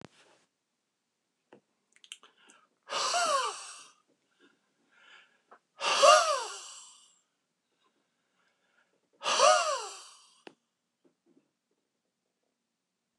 {"exhalation_length": "13.2 s", "exhalation_amplitude": 14797, "exhalation_signal_mean_std_ratio": 0.28, "survey_phase": "alpha (2021-03-01 to 2021-08-12)", "age": "65+", "gender": "Male", "wearing_mask": "No", "symptom_none": true, "smoker_status": "Ex-smoker", "respiratory_condition_asthma": false, "respiratory_condition_other": false, "recruitment_source": "REACT", "submission_delay": "5 days", "covid_test_result": "Negative", "covid_test_method": "RT-qPCR"}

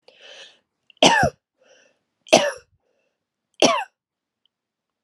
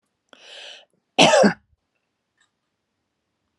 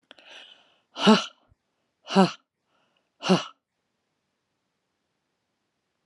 {"three_cough_length": "5.0 s", "three_cough_amplitude": 32767, "three_cough_signal_mean_std_ratio": 0.28, "cough_length": "3.6 s", "cough_amplitude": 31818, "cough_signal_mean_std_ratio": 0.26, "exhalation_length": "6.1 s", "exhalation_amplitude": 24109, "exhalation_signal_mean_std_ratio": 0.22, "survey_phase": "alpha (2021-03-01 to 2021-08-12)", "age": "45-64", "gender": "Female", "wearing_mask": "No", "symptom_none": true, "smoker_status": "Never smoked", "respiratory_condition_asthma": false, "respiratory_condition_other": false, "recruitment_source": "REACT", "submission_delay": "1 day", "covid_test_result": "Negative", "covid_test_method": "RT-qPCR"}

